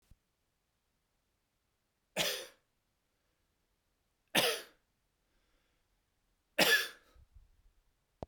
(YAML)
three_cough_length: 8.3 s
three_cough_amplitude: 8697
three_cough_signal_mean_std_ratio: 0.24
survey_phase: beta (2021-08-13 to 2022-03-07)
age: 45-64
gender: Male
wearing_mask: 'No'
symptom_new_continuous_cough: true
smoker_status: Never smoked
respiratory_condition_asthma: false
respiratory_condition_other: false
recruitment_source: Test and Trace
submission_delay: 2 days
covid_test_result: Positive
covid_test_method: RT-qPCR
covid_ct_value: 37.1
covid_ct_gene: N gene